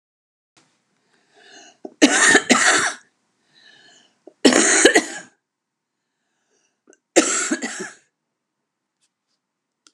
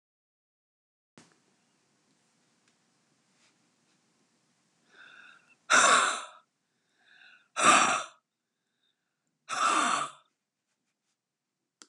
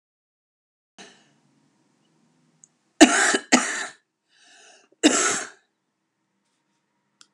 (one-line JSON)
{"three_cough_length": "9.9 s", "three_cough_amplitude": 32767, "three_cough_signal_mean_std_ratio": 0.34, "exhalation_length": "11.9 s", "exhalation_amplitude": 12758, "exhalation_signal_mean_std_ratio": 0.28, "cough_length": "7.3 s", "cough_amplitude": 32767, "cough_signal_mean_std_ratio": 0.26, "survey_phase": "alpha (2021-03-01 to 2021-08-12)", "age": "65+", "gender": "Female", "wearing_mask": "No", "symptom_cough_any": true, "symptom_onset": "8 days", "smoker_status": "Ex-smoker", "respiratory_condition_asthma": true, "respiratory_condition_other": false, "recruitment_source": "REACT", "submission_delay": "2 days", "covid_test_result": "Negative", "covid_test_method": "RT-qPCR"}